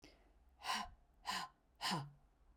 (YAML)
exhalation_length: 2.6 s
exhalation_amplitude: 1324
exhalation_signal_mean_std_ratio: 0.49
survey_phase: beta (2021-08-13 to 2022-03-07)
age: 45-64
gender: Female
wearing_mask: 'No'
symptom_sore_throat: true
symptom_onset: 12 days
smoker_status: Never smoked
respiratory_condition_asthma: false
respiratory_condition_other: false
recruitment_source: REACT
submission_delay: 1 day
covid_test_result: Negative
covid_test_method: RT-qPCR
influenza_a_test_result: Negative
influenza_b_test_result: Negative